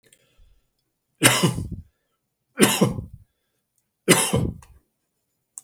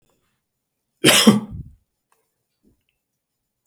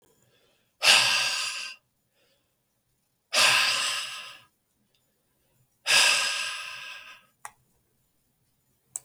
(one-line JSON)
{"three_cough_length": "5.6 s", "three_cough_amplitude": 32768, "three_cough_signal_mean_std_ratio": 0.35, "cough_length": "3.7 s", "cough_amplitude": 32768, "cough_signal_mean_std_ratio": 0.25, "exhalation_length": "9.0 s", "exhalation_amplitude": 19198, "exhalation_signal_mean_std_ratio": 0.4, "survey_phase": "beta (2021-08-13 to 2022-03-07)", "age": "65+", "gender": "Male", "wearing_mask": "No", "symptom_none": true, "symptom_onset": "10 days", "smoker_status": "Ex-smoker", "respiratory_condition_asthma": false, "respiratory_condition_other": false, "recruitment_source": "REACT", "submission_delay": "2 days", "covid_test_result": "Negative", "covid_test_method": "RT-qPCR", "influenza_a_test_result": "Negative", "influenza_b_test_result": "Negative"}